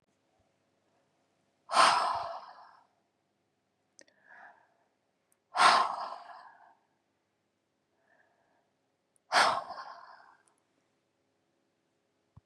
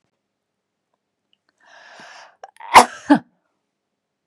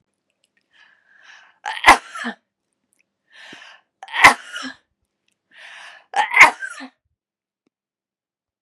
{"exhalation_length": "12.5 s", "exhalation_amplitude": 14234, "exhalation_signal_mean_std_ratio": 0.26, "cough_length": "4.3 s", "cough_amplitude": 32768, "cough_signal_mean_std_ratio": 0.18, "three_cough_length": "8.6 s", "three_cough_amplitude": 32768, "three_cough_signal_mean_std_ratio": 0.22, "survey_phase": "beta (2021-08-13 to 2022-03-07)", "age": "65+", "gender": "Female", "wearing_mask": "No", "symptom_none": true, "symptom_onset": "5 days", "smoker_status": "Never smoked", "respiratory_condition_asthma": false, "respiratory_condition_other": false, "recruitment_source": "REACT", "submission_delay": "2 days", "covid_test_result": "Negative", "covid_test_method": "RT-qPCR", "influenza_a_test_result": "Negative", "influenza_b_test_result": "Negative"}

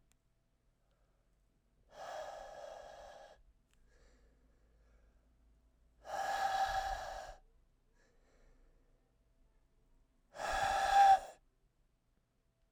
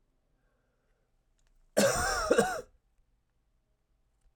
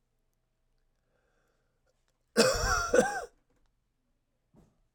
{"exhalation_length": "12.7 s", "exhalation_amplitude": 4259, "exhalation_signal_mean_std_ratio": 0.32, "cough_length": "4.4 s", "cough_amplitude": 9020, "cough_signal_mean_std_ratio": 0.33, "three_cough_length": "4.9 s", "three_cough_amplitude": 10927, "three_cough_signal_mean_std_ratio": 0.31, "survey_phase": "alpha (2021-03-01 to 2021-08-12)", "age": "45-64", "gender": "Male", "wearing_mask": "No", "symptom_cough_any": true, "symptom_new_continuous_cough": true, "symptom_fatigue": true, "symptom_fever_high_temperature": true, "symptom_headache": true, "smoker_status": "Never smoked", "respiratory_condition_asthma": false, "respiratory_condition_other": false, "recruitment_source": "Test and Trace", "submission_delay": "2 days", "covid_test_result": "Positive", "covid_test_method": "RT-qPCR"}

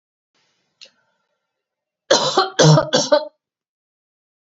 {"three_cough_length": "4.5 s", "three_cough_amplitude": 30887, "three_cough_signal_mean_std_ratio": 0.34, "survey_phase": "beta (2021-08-13 to 2022-03-07)", "age": "45-64", "gender": "Female", "wearing_mask": "No", "symptom_none": true, "smoker_status": "Ex-smoker", "respiratory_condition_asthma": false, "respiratory_condition_other": false, "recruitment_source": "REACT", "submission_delay": "1 day", "covid_test_result": "Negative", "covid_test_method": "RT-qPCR", "influenza_a_test_result": "Negative", "influenza_b_test_result": "Negative"}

